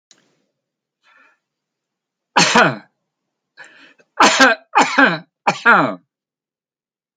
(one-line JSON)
{"three_cough_length": "7.2 s", "three_cough_amplitude": 30068, "three_cough_signal_mean_std_ratio": 0.36, "survey_phase": "alpha (2021-03-01 to 2021-08-12)", "age": "65+", "gender": "Male", "wearing_mask": "No", "symptom_none": true, "smoker_status": "Ex-smoker", "respiratory_condition_asthma": false, "respiratory_condition_other": true, "recruitment_source": "REACT", "submission_delay": "4 days", "covid_test_result": "Negative", "covid_test_method": "RT-qPCR"}